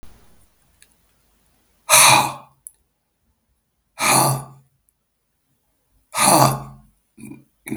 {
  "exhalation_length": "7.8 s",
  "exhalation_amplitude": 32768,
  "exhalation_signal_mean_std_ratio": 0.33,
  "survey_phase": "beta (2021-08-13 to 2022-03-07)",
  "age": "65+",
  "gender": "Male",
  "wearing_mask": "No",
  "symptom_cough_any": true,
  "smoker_status": "Never smoked",
  "respiratory_condition_asthma": false,
  "respiratory_condition_other": false,
  "recruitment_source": "REACT",
  "submission_delay": "1 day",
  "covid_test_result": "Negative",
  "covid_test_method": "RT-qPCR",
  "influenza_a_test_result": "Negative",
  "influenza_b_test_result": "Negative"
}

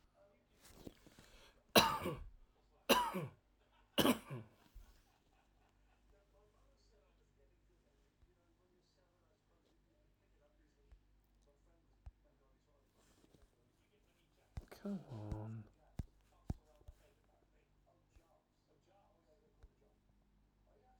{
  "three_cough_length": "21.0 s",
  "three_cough_amplitude": 10014,
  "three_cough_signal_mean_std_ratio": 0.22,
  "survey_phase": "alpha (2021-03-01 to 2021-08-12)",
  "age": "65+",
  "gender": "Male",
  "wearing_mask": "No",
  "symptom_none": true,
  "smoker_status": "Never smoked",
  "respiratory_condition_asthma": false,
  "respiratory_condition_other": true,
  "recruitment_source": "REACT",
  "submission_delay": "2 days",
  "covid_test_result": "Negative",
  "covid_test_method": "RT-qPCR"
}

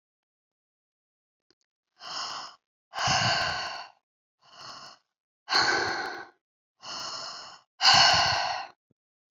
{
  "exhalation_length": "9.3 s",
  "exhalation_amplitude": 16780,
  "exhalation_signal_mean_std_ratio": 0.42,
  "survey_phase": "beta (2021-08-13 to 2022-03-07)",
  "age": "45-64",
  "gender": "Female",
  "wearing_mask": "No",
  "symptom_none": true,
  "symptom_onset": "7 days",
  "smoker_status": "Never smoked",
  "respiratory_condition_asthma": false,
  "respiratory_condition_other": false,
  "recruitment_source": "REACT",
  "submission_delay": "1 day",
  "covid_test_result": "Negative",
  "covid_test_method": "RT-qPCR"
}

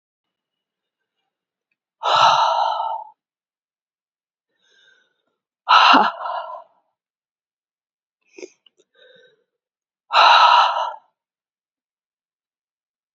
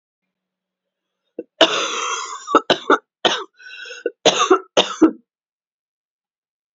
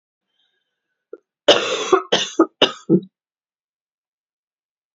{
  "exhalation_length": "13.1 s",
  "exhalation_amplitude": 32768,
  "exhalation_signal_mean_std_ratio": 0.32,
  "cough_length": "6.7 s",
  "cough_amplitude": 32768,
  "cough_signal_mean_std_ratio": 0.36,
  "three_cough_length": "4.9 s",
  "three_cough_amplitude": 29847,
  "three_cough_signal_mean_std_ratio": 0.3,
  "survey_phase": "alpha (2021-03-01 to 2021-08-12)",
  "age": "45-64",
  "gender": "Female",
  "wearing_mask": "No",
  "symptom_new_continuous_cough": true,
  "symptom_fatigue": true,
  "symptom_headache": true,
  "smoker_status": "Never smoked",
  "respiratory_condition_asthma": false,
  "respiratory_condition_other": false,
  "recruitment_source": "Test and Trace",
  "submission_delay": "2 days",
  "covid_test_result": "Positive",
  "covid_test_method": "RT-qPCR"
}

